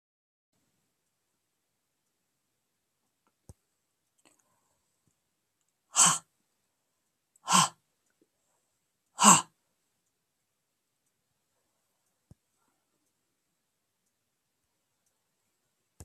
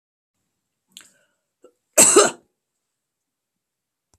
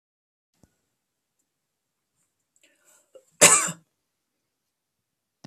exhalation_length: 16.0 s
exhalation_amplitude: 23595
exhalation_signal_mean_std_ratio: 0.15
cough_length: 4.2 s
cough_amplitude: 32768
cough_signal_mean_std_ratio: 0.22
three_cough_length: 5.5 s
three_cough_amplitude: 32767
three_cough_signal_mean_std_ratio: 0.16
survey_phase: alpha (2021-03-01 to 2021-08-12)
age: 65+
gender: Female
wearing_mask: 'No'
symptom_none: true
smoker_status: Never smoked
respiratory_condition_asthma: false
respiratory_condition_other: false
recruitment_source: REACT
submission_delay: 1 day
covid_test_result: Negative
covid_test_method: RT-qPCR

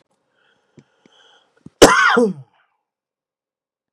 cough_length: 3.9 s
cough_amplitude: 32768
cough_signal_mean_std_ratio: 0.27
survey_phase: beta (2021-08-13 to 2022-03-07)
age: 45-64
gender: Male
wearing_mask: 'No'
symptom_cough_any: true
symptom_sore_throat: true
symptom_onset: 7 days
smoker_status: Ex-smoker
recruitment_source: Test and Trace
submission_delay: 3 days
covid_test_result: Negative
covid_test_method: RT-qPCR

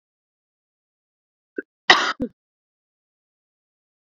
cough_length: 4.1 s
cough_amplitude: 30742
cough_signal_mean_std_ratio: 0.17
survey_phase: beta (2021-08-13 to 2022-03-07)
age: 45-64
gender: Female
wearing_mask: 'No'
symptom_cough_any: true
smoker_status: Current smoker (11 or more cigarettes per day)
respiratory_condition_asthma: true
respiratory_condition_other: false
recruitment_source: Test and Trace
submission_delay: 1 day
covid_test_result: Positive
covid_test_method: RT-qPCR
covid_ct_value: 18.5
covid_ct_gene: ORF1ab gene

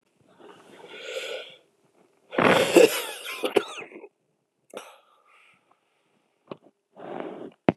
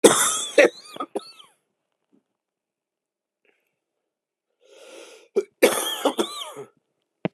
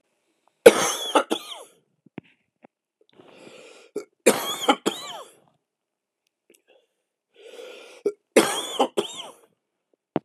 exhalation_length: 7.8 s
exhalation_amplitude: 27079
exhalation_signal_mean_std_ratio: 0.3
cough_length: 7.3 s
cough_amplitude: 32767
cough_signal_mean_std_ratio: 0.29
three_cough_length: 10.2 s
three_cough_amplitude: 32768
three_cough_signal_mean_std_ratio: 0.26
survey_phase: beta (2021-08-13 to 2022-03-07)
age: 45-64
gender: Male
wearing_mask: 'No'
symptom_cough_any: true
symptom_runny_or_blocked_nose: true
symptom_sore_throat: true
symptom_abdominal_pain: true
symptom_fever_high_temperature: true
symptom_headache: true
symptom_onset: 4 days
smoker_status: Ex-smoker
respiratory_condition_asthma: false
respiratory_condition_other: false
recruitment_source: Test and Trace
submission_delay: 2 days
covid_test_result: Positive
covid_test_method: LAMP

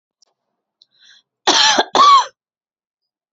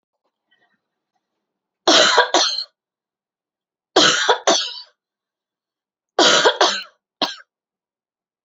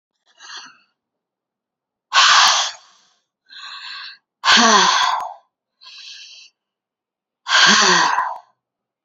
cough_length: 3.3 s
cough_amplitude: 32062
cough_signal_mean_std_ratio: 0.38
three_cough_length: 8.4 s
three_cough_amplitude: 32336
three_cough_signal_mean_std_ratio: 0.37
exhalation_length: 9.0 s
exhalation_amplitude: 32047
exhalation_signal_mean_std_ratio: 0.43
survey_phase: beta (2021-08-13 to 2022-03-07)
age: 45-64
gender: Female
wearing_mask: 'No'
symptom_fatigue: true
symptom_change_to_sense_of_smell_or_taste: true
symptom_onset: 13 days
smoker_status: Never smoked
respiratory_condition_asthma: false
respiratory_condition_other: false
recruitment_source: REACT
submission_delay: 1 day
covid_test_result: Negative
covid_test_method: RT-qPCR
influenza_a_test_result: Negative
influenza_b_test_result: Negative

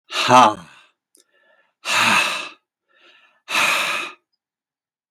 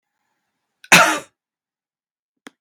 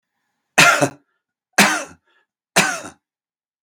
exhalation_length: 5.1 s
exhalation_amplitude: 32768
exhalation_signal_mean_std_ratio: 0.41
cough_length: 2.6 s
cough_amplitude: 32768
cough_signal_mean_std_ratio: 0.23
three_cough_length: 3.6 s
three_cough_amplitude: 32768
three_cough_signal_mean_std_ratio: 0.34
survey_phase: beta (2021-08-13 to 2022-03-07)
age: 65+
gender: Male
wearing_mask: 'No'
symptom_none: true
smoker_status: Ex-smoker
respiratory_condition_asthma: false
respiratory_condition_other: false
recruitment_source: REACT
submission_delay: 2 days
covid_test_result: Negative
covid_test_method: RT-qPCR
influenza_a_test_result: Negative
influenza_b_test_result: Negative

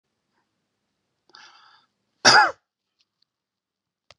cough_length: 4.2 s
cough_amplitude: 30557
cough_signal_mean_std_ratio: 0.19
survey_phase: beta (2021-08-13 to 2022-03-07)
age: 65+
gender: Male
wearing_mask: 'No'
symptom_none: true
smoker_status: Ex-smoker
respiratory_condition_asthma: false
respiratory_condition_other: false
recruitment_source: REACT
submission_delay: 3 days
covid_test_result: Negative
covid_test_method: RT-qPCR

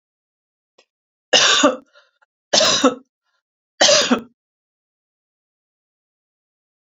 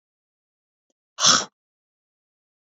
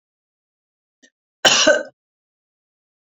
three_cough_length: 6.9 s
three_cough_amplitude: 32768
three_cough_signal_mean_std_ratio: 0.33
exhalation_length: 2.6 s
exhalation_amplitude: 25564
exhalation_signal_mean_std_ratio: 0.22
cough_length: 3.1 s
cough_amplitude: 30854
cough_signal_mean_std_ratio: 0.27
survey_phase: beta (2021-08-13 to 2022-03-07)
age: 45-64
gender: Female
wearing_mask: 'No'
symptom_none: true
smoker_status: Never smoked
respiratory_condition_asthma: false
respiratory_condition_other: false
recruitment_source: REACT
submission_delay: 2 days
covid_test_result: Negative
covid_test_method: RT-qPCR
influenza_a_test_result: Negative
influenza_b_test_result: Negative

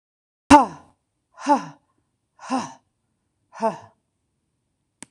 exhalation_length: 5.1 s
exhalation_amplitude: 26028
exhalation_signal_mean_std_ratio: 0.23
survey_phase: beta (2021-08-13 to 2022-03-07)
age: 65+
gender: Female
wearing_mask: 'No'
symptom_cough_any: true
symptom_shortness_of_breath: true
symptom_sore_throat: true
symptom_fatigue: true
symptom_loss_of_taste: true
symptom_onset: 12 days
smoker_status: Never smoked
respiratory_condition_asthma: false
respiratory_condition_other: true
recruitment_source: REACT
submission_delay: 2 days
covid_test_result: Negative
covid_test_method: RT-qPCR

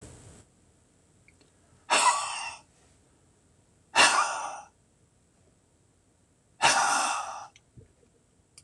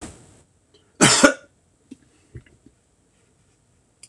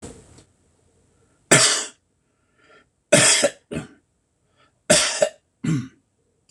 exhalation_length: 8.6 s
exhalation_amplitude: 16701
exhalation_signal_mean_std_ratio: 0.36
cough_length: 4.1 s
cough_amplitude: 26028
cough_signal_mean_std_ratio: 0.23
three_cough_length: 6.5 s
three_cough_amplitude: 26028
three_cough_signal_mean_std_ratio: 0.35
survey_phase: beta (2021-08-13 to 2022-03-07)
age: 65+
gender: Male
wearing_mask: 'No'
symptom_other: true
symptom_onset: 7 days
smoker_status: Ex-smoker
respiratory_condition_asthma: false
respiratory_condition_other: false
recruitment_source: REACT
submission_delay: 4 days
covid_test_result: Negative
covid_test_method: RT-qPCR
influenza_a_test_result: Negative
influenza_b_test_result: Negative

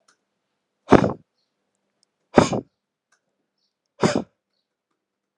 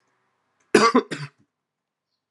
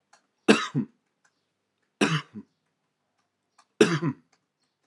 exhalation_length: 5.4 s
exhalation_amplitude: 32768
exhalation_signal_mean_std_ratio: 0.21
cough_length: 2.3 s
cough_amplitude: 29833
cough_signal_mean_std_ratio: 0.28
three_cough_length: 4.9 s
three_cough_amplitude: 26653
three_cough_signal_mean_std_ratio: 0.27
survey_phase: alpha (2021-03-01 to 2021-08-12)
age: 18-44
gender: Male
wearing_mask: 'No'
symptom_cough_any: true
symptom_new_continuous_cough: true
symptom_fatigue: true
symptom_fever_high_temperature: true
symptom_onset: 4 days
smoker_status: Never smoked
respiratory_condition_asthma: false
respiratory_condition_other: false
recruitment_source: Test and Trace
submission_delay: 1 day
covid_test_result: Positive
covid_test_method: RT-qPCR
covid_ct_value: 17.6
covid_ct_gene: ORF1ab gene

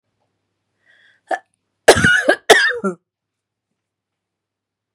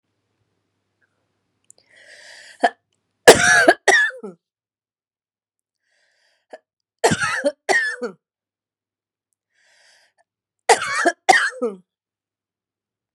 cough_length: 4.9 s
cough_amplitude: 32768
cough_signal_mean_std_ratio: 0.3
three_cough_length: 13.1 s
three_cough_amplitude: 32768
three_cough_signal_mean_std_ratio: 0.29
survey_phase: beta (2021-08-13 to 2022-03-07)
age: 45-64
gender: Female
wearing_mask: 'No'
symptom_runny_or_blocked_nose: true
symptom_headache: true
smoker_status: Current smoker (e-cigarettes or vapes only)
respiratory_condition_asthma: true
respiratory_condition_other: false
recruitment_source: REACT
submission_delay: 3 days
covid_test_result: Negative
covid_test_method: RT-qPCR
influenza_a_test_result: Negative
influenza_b_test_result: Negative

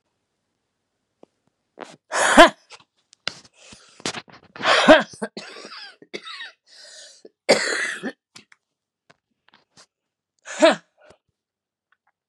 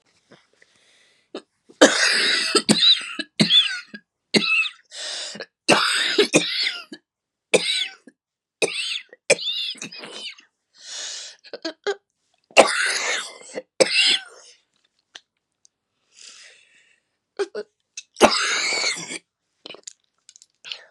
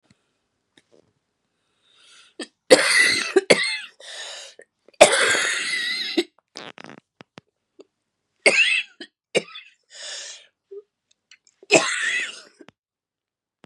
exhalation_length: 12.3 s
exhalation_amplitude: 32768
exhalation_signal_mean_std_ratio: 0.25
three_cough_length: 20.9 s
three_cough_amplitude: 32768
three_cough_signal_mean_std_ratio: 0.42
cough_length: 13.7 s
cough_amplitude: 32768
cough_signal_mean_std_ratio: 0.35
survey_phase: beta (2021-08-13 to 2022-03-07)
age: 45-64
gender: Female
wearing_mask: 'No'
symptom_cough_any: true
symptom_runny_or_blocked_nose: true
symptom_fatigue: true
smoker_status: Ex-smoker
respiratory_condition_asthma: false
respiratory_condition_other: false
recruitment_source: Test and Trace
submission_delay: -1 day
covid_test_result: Positive
covid_test_method: LFT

